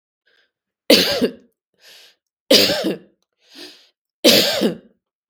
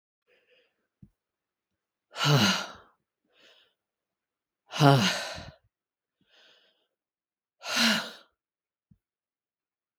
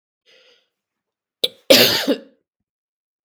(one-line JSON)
{"three_cough_length": "5.3 s", "three_cough_amplitude": 32768, "three_cough_signal_mean_std_ratio": 0.38, "exhalation_length": "10.0 s", "exhalation_amplitude": 22705, "exhalation_signal_mean_std_ratio": 0.28, "cough_length": "3.2 s", "cough_amplitude": 32768, "cough_signal_mean_std_ratio": 0.28, "survey_phase": "beta (2021-08-13 to 2022-03-07)", "age": "45-64", "gender": "Female", "wearing_mask": "No", "symptom_runny_or_blocked_nose": true, "symptom_sore_throat": true, "smoker_status": "Never smoked", "respiratory_condition_asthma": false, "respiratory_condition_other": false, "recruitment_source": "REACT", "submission_delay": "1 day", "covid_test_result": "Negative", "covid_test_method": "RT-qPCR", "influenza_a_test_result": "Negative", "influenza_b_test_result": "Negative"}